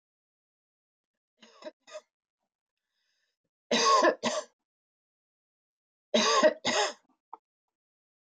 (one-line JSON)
{"three_cough_length": "8.4 s", "three_cough_amplitude": 9834, "three_cough_signal_mean_std_ratio": 0.31, "survey_phase": "beta (2021-08-13 to 2022-03-07)", "age": "65+", "gender": "Female", "wearing_mask": "No", "symptom_none": true, "smoker_status": "Current smoker (1 to 10 cigarettes per day)", "respiratory_condition_asthma": false, "respiratory_condition_other": false, "recruitment_source": "REACT", "submission_delay": "4 days", "covid_test_result": "Negative", "covid_test_method": "RT-qPCR", "influenza_a_test_result": "Unknown/Void", "influenza_b_test_result": "Unknown/Void"}